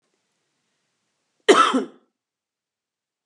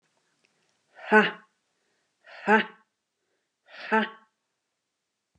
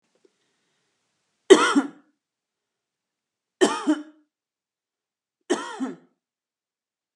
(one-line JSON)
{"cough_length": "3.3 s", "cough_amplitude": 29039, "cough_signal_mean_std_ratio": 0.24, "exhalation_length": "5.4 s", "exhalation_amplitude": 23420, "exhalation_signal_mean_std_ratio": 0.24, "three_cough_length": "7.2 s", "three_cough_amplitude": 32293, "three_cough_signal_mean_std_ratio": 0.23, "survey_phase": "alpha (2021-03-01 to 2021-08-12)", "age": "45-64", "gender": "Female", "wearing_mask": "No", "symptom_none": true, "smoker_status": "Never smoked", "respiratory_condition_asthma": false, "respiratory_condition_other": false, "recruitment_source": "REACT", "submission_delay": "2 days", "covid_test_result": "Negative", "covid_test_method": "RT-qPCR"}